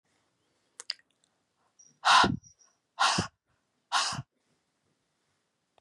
{
  "exhalation_length": "5.8 s",
  "exhalation_amplitude": 11796,
  "exhalation_signal_mean_std_ratio": 0.28,
  "survey_phase": "beta (2021-08-13 to 2022-03-07)",
  "age": "45-64",
  "gender": "Female",
  "wearing_mask": "No",
  "symptom_none": true,
  "smoker_status": "Never smoked",
  "respiratory_condition_asthma": false,
  "respiratory_condition_other": false,
  "recruitment_source": "REACT",
  "submission_delay": "1 day",
  "covid_test_result": "Negative",
  "covid_test_method": "RT-qPCR",
  "influenza_a_test_result": "Negative",
  "influenza_b_test_result": "Negative"
}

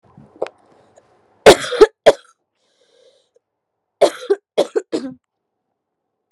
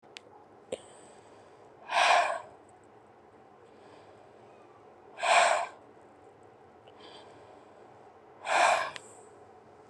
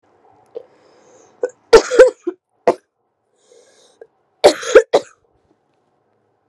{
  "three_cough_length": "6.3 s",
  "three_cough_amplitude": 32768,
  "three_cough_signal_mean_std_ratio": 0.24,
  "exhalation_length": "9.9 s",
  "exhalation_amplitude": 10255,
  "exhalation_signal_mean_std_ratio": 0.36,
  "cough_length": "6.5 s",
  "cough_amplitude": 32768,
  "cough_signal_mean_std_ratio": 0.25,
  "survey_phase": "alpha (2021-03-01 to 2021-08-12)",
  "age": "18-44",
  "gender": "Female",
  "wearing_mask": "No",
  "symptom_cough_any": true,
  "symptom_fatigue": true,
  "symptom_headache": true,
  "symptom_change_to_sense_of_smell_or_taste": true,
  "symptom_loss_of_taste": true,
  "symptom_onset": "2 days",
  "smoker_status": "Current smoker (e-cigarettes or vapes only)",
  "respiratory_condition_asthma": false,
  "respiratory_condition_other": false,
  "recruitment_source": "Test and Trace",
  "submission_delay": "2 days",
  "covid_test_result": "Positive",
  "covid_test_method": "RT-qPCR",
  "covid_ct_value": 18.8,
  "covid_ct_gene": "ORF1ab gene",
  "covid_ct_mean": 19.3,
  "covid_viral_load": "480000 copies/ml",
  "covid_viral_load_category": "Low viral load (10K-1M copies/ml)"
}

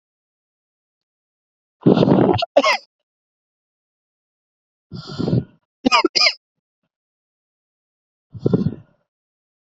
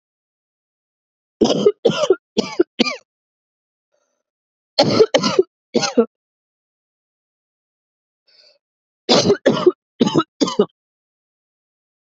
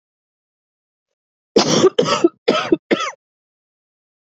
{
  "exhalation_length": "9.7 s",
  "exhalation_amplitude": 32767,
  "exhalation_signal_mean_std_ratio": 0.31,
  "three_cough_length": "12.0 s",
  "three_cough_amplitude": 32768,
  "three_cough_signal_mean_std_ratio": 0.33,
  "cough_length": "4.3 s",
  "cough_amplitude": 27890,
  "cough_signal_mean_std_ratio": 0.36,
  "survey_phase": "alpha (2021-03-01 to 2021-08-12)",
  "age": "18-44",
  "gender": "Female",
  "wearing_mask": "No",
  "symptom_cough_any": true,
  "symptom_new_continuous_cough": true,
  "symptom_shortness_of_breath": true,
  "symptom_fatigue": true,
  "symptom_fever_high_temperature": true,
  "symptom_headache": true,
  "smoker_status": "Never smoked",
  "respiratory_condition_asthma": true,
  "respiratory_condition_other": false,
  "recruitment_source": "Test and Trace",
  "submission_delay": "3 days",
  "covid_test_result": "Positive",
  "covid_test_method": "RT-qPCR"
}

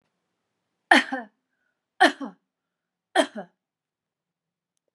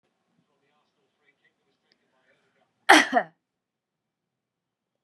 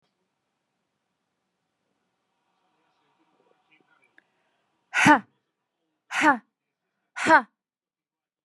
{
  "three_cough_length": "4.9 s",
  "three_cough_amplitude": 32241,
  "three_cough_signal_mean_std_ratio": 0.22,
  "cough_length": "5.0 s",
  "cough_amplitude": 30313,
  "cough_signal_mean_std_ratio": 0.17,
  "exhalation_length": "8.4 s",
  "exhalation_amplitude": 25042,
  "exhalation_signal_mean_std_ratio": 0.2,
  "survey_phase": "beta (2021-08-13 to 2022-03-07)",
  "age": "45-64",
  "gender": "Female",
  "wearing_mask": "No",
  "symptom_none": true,
  "smoker_status": "Never smoked",
  "respiratory_condition_asthma": false,
  "respiratory_condition_other": false,
  "recruitment_source": "REACT",
  "submission_delay": "1 day",
  "covid_test_result": "Negative",
  "covid_test_method": "RT-qPCR",
  "influenza_a_test_result": "Negative",
  "influenza_b_test_result": "Negative"
}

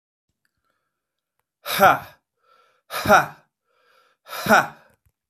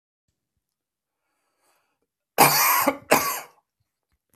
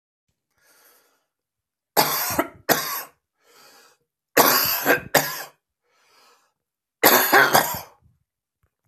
{
  "exhalation_length": "5.3 s",
  "exhalation_amplitude": 24718,
  "exhalation_signal_mean_std_ratio": 0.28,
  "cough_length": "4.4 s",
  "cough_amplitude": 29735,
  "cough_signal_mean_std_ratio": 0.32,
  "three_cough_length": "8.9 s",
  "three_cough_amplitude": 31551,
  "three_cough_signal_mean_std_ratio": 0.37,
  "survey_phase": "beta (2021-08-13 to 2022-03-07)",
  "age": "65+",
  "gender": "Male",
  "wearing_mask": "No",
  "symptom_runny_or_blocked_nose": true,
  "symptom_onset": "12 days",
  "smoker_status": "Ex-smoker",
  "respiratory_condition_asthma": false,
  "respiratory_condition_other": false,
  "recruitment_source": "REACT",
  "submission_delay": "2 days",
  "covid_test_result": "Negative",
  "covid_test_method": "RT-qPCR"
}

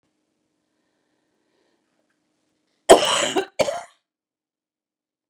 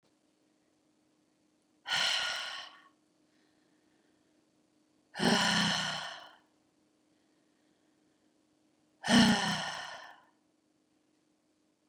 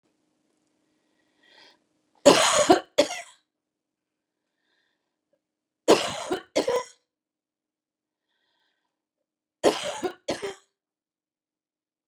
{
  "cough_length": "5.3 s",
  "cough_amplitude": 32768,
  "cough_signal_mean_std_ratio": 0.22,
  "exhalation_length": "11.9 s",
  "exhalation_amplitude": 8152,
  "exhalation_signal_mean_std_ratio": 0.33,
  "three_cough_length": "12.1 s",
  "three_cough_amplitude": 29152,
  "three_cough_signal_mean_std_ratio": 0.25,
  "survey_phase": "beta (2021-08-13 to 2022-03-07)",
  "age": "45-64",
  "gender": "Female",
  "wearing_mask": "No",
  "symptom_none": true,
  "smoker_status": "Never smoked",
  "respiratory_condition_asthma": false,
  "respiratory_condition_other": false,
  "recruitment_source": "REACT",
  "submission_delay": "1 day",
  "covid_test_result": "Negative",
  "covid_test_method": "RT-qPCR",
  "influenza_a_test_result": "Negative",
  "influenza_b_test_result": "Negative"
}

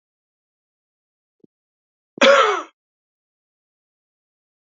{
  "cough_length": "4.7 s",
  "cough_amplitude": 28051,
  "cough_signal_mean_std_ratio": 0.22,
  "survey_phase": "beta (2021-08-13 to 2022-03-07)",
  "age": "65+",
  "gender": "Male",
  "wearing_mask": "No",
  "symptom_cough_any": true,
  "symptom_runny_or_blocked_nose": true,
  "symptom_headache": true,
  "smoker_status": "Never smoked",
  "respiratory_condition_asthma": false,
  "respiratory_condition_other": false,
  "recruitment_source": "Test and Trace",
  "submission_delay": "3 days",
  "covid_test_result": "Positive",
  "covid_test_method": "RT-qPCR",
  "covid_ct_value": 17.0,
  "covid_ct_gene": "N gene"
}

